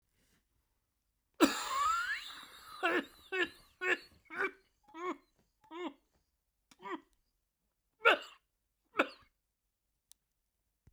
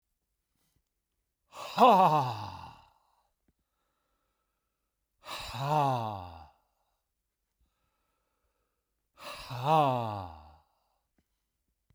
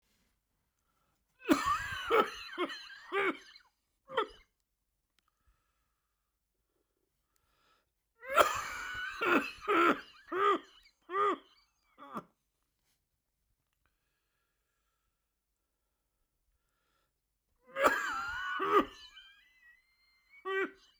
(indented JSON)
{
  "cough_length": "10.9 s",
  "cough_amplitude": 9002,
  "cough_signal_mean_std_ratio": 0.33,
  "exhalation_length": "11.9 s",
  "exhalation_amplitude": 11399,
  "exhalation_signal_mean_std_ratio": 0.31,
  "three_cough_length": "21.0 s",
  "three_cough_amplitude": 10589,
  "three_cough_signal_mean_std_ratio": 0.35,
  "survey_phase": "beta (2021-08-13 to 2022-03-07)",
  "age": "65+",
  "gender": "Male",
  "wearing_mask": "No",
  "symptom_cough_any": true,
  "symptom_runny_or_blocked_nose": true,
  "symptom_sore_throat": true,
  "symptom_fatigue": true,
  "symptom_onset": "5 days",
  "smoker_status": "Ex-smoker",
  "respiratory_condition_asthma": false,
  "respiratory_condition_other": true,
  "recruitment_source": "Test and Trace",
  "submission_delay": "1 day",
  "covid_test_result": "Positive",
  "covid_test_method": "RT-qPCR"
}